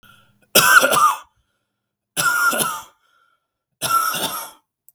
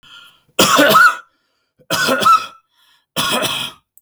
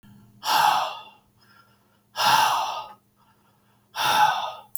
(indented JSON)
{
  "three_cough_length": "4.9 s",
  "three_cough_amplitude": 32768,
  "three_cough_signal_mean_std_ratio": 0.47,
  "cough_length": "4.0 s",
  "cough_amplitude": 32766,
  "cough_signal_mean_std_ratio": 0.52,
  "exhalation_length": "4.8 s",
  "exhalation_amplitude": 16361,
  "exhalation_signal_mean_std_ratio": 0.51,
  "survey_phase": "beta (2021-08-13 to 2022-03-07)",
  "age": "18-44",
  "gender": "Male",
  "wearing_mask": "No",
  "symptom_none": true,
  "smoker_status": "Never smoked",
  "respiratory_condition_asthma": false,
  "respiratory_condition_other": false,
  "recruitment_source": "REACT",
  "submission_delay": "3 days",
  "covid_test_result": "Negative",
  "covid_test_method": "RT-qPCR",
  "influenza_a_test_result": "Negative",
  "influenza_b_test_result": "Negative"
}